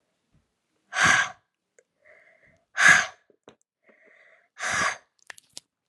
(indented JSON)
{
  "exhalation_length": "5.9 s",
  "exhalation_amplitude": 25364,
  "exhalation_signal_mean_std_ratio": 0.3,
  "survey_phase": "alpha (2021-03-01 to 2021-08-12)",
  "age": "18-44",
  "gender": "Female",
  "wearing_mask": "No",
  "symptom_cough_any": true,
  "symptom_new_continuous_cough": true,
  "symptom_fever_high_temperature": true,
  "symptom_headache": true,
  "symptom_change_to_sense_of_smell_or_taste": true,
  "symptom_loss_of_taste": true,
  "symptom_onset": "3 days",
  "smoker_status": "Never smoked",
  "respiratory_condition_asthma": false,
  "respiratory_condition_other": false,
  "recruitment_source": "Test and Trace",
  "submission_delay": "2 days",
  "covid_test_result": "Positive",
  "covid_test_method": "RT-qPCR",
  "covid_ct_value": 14.0,
  "covid_ct_gene": "ORF1ab gene",
  "covid_ct_mean": 14.4,
  "covid_viral_load": "18000000 copies/ml",
  "covid_viral_load_category": "High viral load (>1M copies/ml)"
}